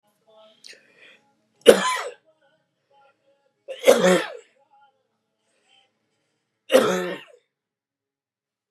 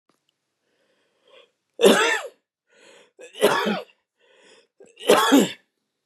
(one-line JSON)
{"three_cough_length": "8.7 s", "three_cough_amplitude": 32768, "three_cough_signal_mean_std_ratio": 0.26, "cough_length": "6.1 s", "cough_amplitude": 28604, "cough_signal_mean_std_ratio": 0.35, "survey_phase": "beta (2021-08-13 to 2022-03-07)", "age": "65+", "gender": "Male", "wearing_mask": "No", "symptom_cough_any": true, "symptom_runny_or_blocked_nose": true, "symptom_sore_throat": true, "symptom_fatigue": true, "symptom_headache": true, "symptom_onset": "11 days", "smoker_status": "Never smoked", "respiratory_condition_asthma": true, "respiratory_condition_other": false, "recruitment_source": "REACT", "submission_delay": "1 day", "covid_test_result": "Negative", "covid_test_method": "RT-qPCR"}